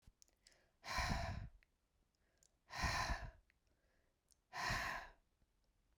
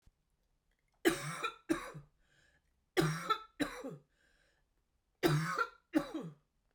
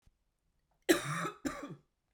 {"exhalation_length": "6.0 s", "exhalation_amplitude": 1485, "exhalation_signal_mean_std_ratio": 0.45, "three_cough_length": "6.7 s", "three_cough_amplitude": 5583, "three_cough_signal_mean_std_ratio": 0.4, "cough_length": "2.1 s", "cough_amplitude": 7888, "cough_signal_mean_std_ratio": 0.35, "survey_phase": "beta (2021-08-13 to 2022-03-07)", "age": "18-44", "gender": "Female", "wearing_mask": "No", "symptom_cough_any": true, "symptom_shortness_of_breath": true, "symptom_abdominal_pain": true, "symptom_diarrhoea": true, "symptom_fatigue": true, "smoker_status": "Never smoked", "respiratory_condition_asthma": false, "respiratory_condition_other": false, "recruitment_source": "Test and Trace", "submission_delay": "1 day", "covid_test_result": "Positive", "covid_test_method": "RT-qPCR"}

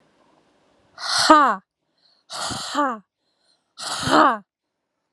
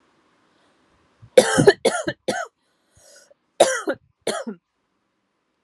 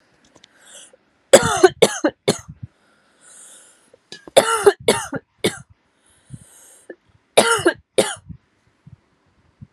{"exhalation_length": "5.1 s", "exhalation_amplitude": 32767, "exhalation_signal_mean_std_ratio": 0.37, "cough_length": "5.6 s", "cough_amplitude": 32768, "cough_signal_mean_std_ratio": 0.29, "three_cough_length": "9.7 s", "three_cough_amplitude": 32768, "three_cough_signal_mean_std_ratio": 0.29, "survey_phase": "alpha (2021-03-01 to 2021-08-12)", "age": "18-44", "gender": "Female", "wearing_mask": "No", "symptom_fatigue": true, "symptom_onset": "9 days", "smoker_status": "Never smoked", "respiratory_condition_asthma": true, "respiratory_condition_other": false, "recruitment_source": "REACT", "submission_delay": "1 day", "covid_test_result": "Negative", "covid_test_method": "RT-qPCR"}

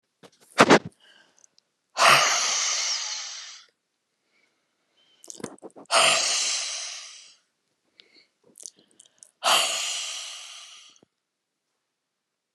{"exhalation_length": "12.5 s", "exhalation_amplitude": 29203, "exhalation_signal_mean_std_ratio": 0.37, "survey_phase": "beta (2021-08-13 to 2022-03-07)", "age": "65+", "gender": "Female", "wearing_mask": "No", "symptom_none": true, "smoker_status": "Ex-smoker", "respiratory_condition_asthma": false, "respiratory_condition_other": false, "recruitment_source": "REACT", "submission_delay": "1 day", "covid_test_result": "Negative", "covid_test_method": "RT-qPCR"}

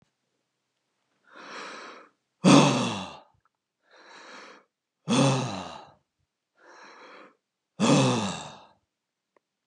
{"cough_length": "9.7 s", "cough_amplitude": 21059, "cough_signal_mean_std_ratio": 0.34, "survey_phase": "beta (2021-08-13 to 2022-03-07)", "age": "65+", "gender": "Male", "wearing_mask": "No", "symptom_none": true, "smoker_status": "Ex-smoker", "respiratory_condition_asthma": false, "respiratory_condition_other": false, "recruitment_source": "REACT", "submission_delay": "2 days", "covid_test_result": "Negative", "covid_test_method": "RT-qPCR"}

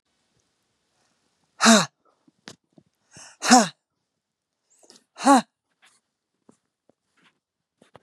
{"exhalation_length": "8.0 s", "exhalation_amplitude": 32444, "exhalation_signal_mean_std_ratio": 0.21, "survey_phase": "beta (2021-08-13 to 2022-03-07)", "age": "45-64", "gender": "Female", "wearing_mask": "No", "symptom_none": true, "smoker_status": "Never smoked", "respiratory_condition_asthma": false, "respiratory_condition_other": true, "recruitment_source": "REACT", "submission_delay": "0 days", "covid_test_result": "Negative", "covid_test_method": "RT-qPCR", "influenza_a_test_result": "Negative", "influenza_b_test_result": "Negative"}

